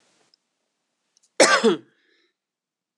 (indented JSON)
{
  "cough_length": "3.0 s",
  "cough_amplitude": 25579,
  "cough_signal_mean_std_ratio": 0.26,
  "survey_phase": "beta (2021-08-13 to 2022-03-07)",
  "age": "45-64",
  "gender": "Female",
  "wearing_mask": "Yes",
  "symptom_cough_any": true,
  "symptom_runny_or_blocked_nose": true,
  "symptom_headache": true,
  "symptom_change_to_sense_of_smell_or_taste": true,
  "symptom_loss_of_taste": true,
  "symptom_onset": "4 days",
  "smoker_status": "Never smoked",
  "respiratory_condition_asthma": false,
  "respiratory_condition_other": false,
  "recruitment_source": "Test and Trace",
  "submission_delay": "1 day",
  "covid_test_result": "Positive",
  "covid_test_method": "RT-qPCR",
  "covid_ct_value": 21.4,
  "covid_ct_gene": "N gene"
}